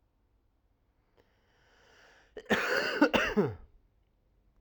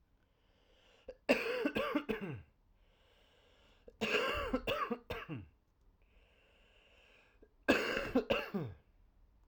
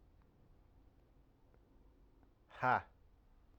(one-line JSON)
{"cough_length": "4.6 s", "cough_amplitude": 9781, "cough_signal_mean_std_ratio": 0.36, "three_cough_length": "9.5 s", "three_cough_amplitude": 6162, "three_cough_signal_mean_std_ratio": 0.45, "exhalation_length": "3.6 s", "exhalation_amplitude": 3359, "exhalation_signal_mean_std_ratio": 0.24, "survey_phase": "alpha (2021-03-01 to 2021-08-12)", "age": "18-44", "gender": "Male", "wearing_mask": "No", "symptom_cough_any": true, "symptom_fatigue": true, "symptom_headache": true, "smoker_status": "Never smoked", "respiratory_condition_asthma": false, "respiratory_condition_other": false, "recruitment_source": "Test and Trace", "submission_delay": "1 day", "covid_test_result": "Positive", "covid_test_method": "RT-qPCR"}